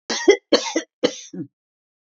{"cough_length": "2.1 s", "cough_amplitude": 27339, "cough_signal_mean_std_ratio": 0.36, "survey_phase": "beta (2021-08-13 to 2022-03-07)", "age": "65+", "gender": "Female", "wearing_mask": "No", "symptom_none": true, "smoker_status": "Never smoked", "respiratory_condition_asthma": false, "respiratory_condition_other": false, "recruitment_source": "REACT", "submission_delay": "6 days", "covid_test_result": "Negative", "covid_test_method": "RT-qPCR"}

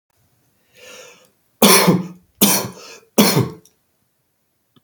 {"three_cough_length": "4.8 s", "three_cough_amplitude": 32768, "three_cough_signal_mean_std_ratio": 0.36, "survey_phase": "beta (2021-08-13 to 2022-03-07)", "age": "45-64", "gender": "Male", "wearing_mask": "No", "symptom_none": true, "smoker_status": "Never smoked", "respiratory_condition_asthma": false, "respiratory_condition_other": false, "recruitment_source": "REACT", "submission_delay": "2 days", "covid_test_result": "Negative", "covid_test_method": "RT-qPCR", "influenza_a_test_result": "Negative", "influenza_b_test_result": "Negative"}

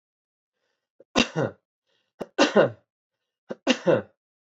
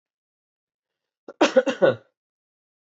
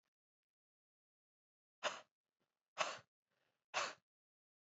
{"three_cough_length": "4.4 s", "three_cough_amplitude": 17955, "three_cough_signal_mean_std_ratio": 0.31, "cough_length": "2.8 s", "cough_amplitude": 18870, "cough_signal_mean_std_ratio": 0.27, "exhalation_length": "4.6 s", "exhalation_amplitude": 2589, "exhalation_signal_mean_std_ratio": 0.24, "survey_phase": "beta (2021-08-13 to 2022-03-07)", "age": "18-44", "gender": "Male", "wearing_mask": "No", "symptom_runny_or_blocked_nose": true, "symptom_fatigue": true, "symptom_fever_high_temperature": true, "symptom_headache": true, "smoker_status": "Never smoked", "respiratory_condition_asthma": false, "respiratory_condition_other": false, "recruitment_source": "Test and Trace", "submission_delay": "1 day", "covid_test_result": "Positive", "covid_test_method": "LFT"}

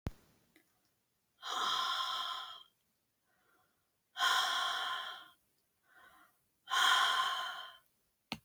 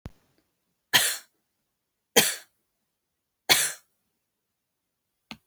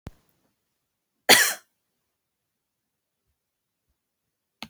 {"exhalation_length": "8.4 s", "exhalation_amplitude": 4499, "exhalation_signal_mean_std_ratio": 0.49, "three_cough_length": "5.5 s", "three_cough_amplitude": 25079, "three_cough_signal_mean_std_ratio": 0.25, "cough_length": "4.7 s", "cough_amplitude": 30621, "cough_signal_mean_std_ratio": 0.17, "survey_phase": "beta (2021-08-13 to 2022-03-07)", "age": "45-64", "gender": "Female", "wearing_mask": "No", "symptom_none": true, "smoker_status": "Never smoked", "respiratory_condition_asthma": false, "respiratory_condition_other": false, "recruitment_source": "REACT", "submission_delay": "1 day", "covid_test_result": "Negative", "covid_test_method": "RT-qPCR", "influenza_a_test_result": "Negative", "influenza_b_test_result": "Negative"}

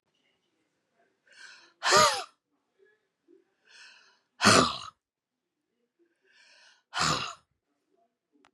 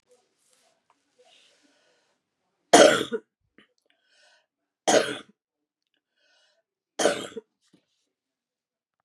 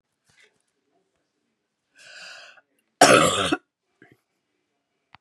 {"exhalation_length": "8.5 s", "exhalation_amplitude": 16859, "exhalation_signal_mean_std_ratio": 0.26, "three_cough_length": "9.0 s", "three_cough_amplitude": 30871, "three_cough_signal_mean_std_ratio": 0.21, "cough_length": "5.2 s", "cough_amplitude": 31616, "cough_signal_mean_std_ratio": 0.24, "survey_phase": "beta (2021-08-13 to 2022-03-07)", "age": "65+", "gender": "Female", "wearing_mask": "No", "symptom_cough_any": true, "symptom_runny_or_blocked_nose": true, "smoker_status": "Ex-smoker", "respiratory_condition_asthma": false, "respiratory_condition_other": false, "recruitment_source": "Test and Trace", "submission_delay": "2 days", "covid_test_result": "Positive", "covid_test_method": "LFT"}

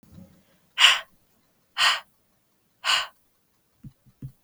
{"exhalation_length": "4.4 s", "exhalation_amplitude": 32477, "exhalation_signal_mean_std_ratio": 0.29, "survey_phase": "beta (2021-08-13 to 2022-03-07)", "age": "18-44", "gender": "Female", "wearing_mask": "No", "symptom_cough_any": true, "symptom_runny_or_blocked_nose": true, "symptom_sore_throat": true, "symptom_abdominal_pain": true, "symptom_headache": true, "symptom_change_to_sense_of_smell_or_taste": true, "smoker_status": "Ex-smoker", "respiratory_condition_asthma": false, "respiratory_condition_other": false, "recruitment_source": "Test and Trace", "submission_delay": "2 days", "covid_test_result": "Positive", "covid_test_method": "RT-qPCR", "covid_ct_value": 31.2, "covid_ct_gene": "ORF1ab gene"}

